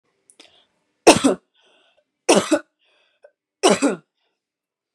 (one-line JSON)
{"three_cough_length": "4.9 s", "three_cough_amplitude": 32768, "three_cough_signal_mean_std_ratio": 0.28, "survey_phase": "beta (2021-08-13 to 2022-03-07)", "age": "18-44", "gender": "Female", "wearing_mask": "No", "symptom_cough_any": true, "symptom_runny_or_blocked_nose": true, "symptom_fatigue": true, "smoker_status": "Never smoked", "respiratory_condition_asthma": false, "respiratory_condition_other": false, "recruitment_source": "Test and Trace", "submission_delay": "2 days", "covid_test_result": "Positive", "covid_test_method": "RT-qPCR", "covid_ct_value": 27.2, "covid_ct_gene": "ORF1ab gene"}